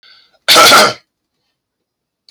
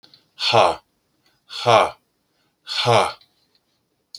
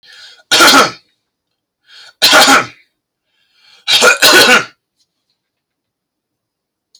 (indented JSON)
{
  "cough_length": "2.3 s",
  "cough_amplitude": 32768,
  "cough_signal_mean_std_ratio": 0.4,
  "exhalation_length": "4.2 s",
  "exhalation_amplitude": 28090,
  "exhalation_signal_mean_std_ratio": 0.38,
  "three_cough_length": "7.0 s",
  "three_cough_amplitude": 32768,
  "three_cough_signal_mean_std_ratio": 0.42,
  "survey_phase": "beta (2021-08-13 to 2022-03-07)",
  "age": "45-64",
  "gender": "Male",
  "wearing_mask": "No",
  "symptom_none": true,
  "smoker_status": "Never smoked",
  "respiratory_condition_asthma": false,
  "respiratory_condition_other": false,
  "recruitment_source": "REACT",
  "submission_delay": "2 days",
  "covid_test_result": "Negative",
  "covid_test_method": "RT-qPCR"
}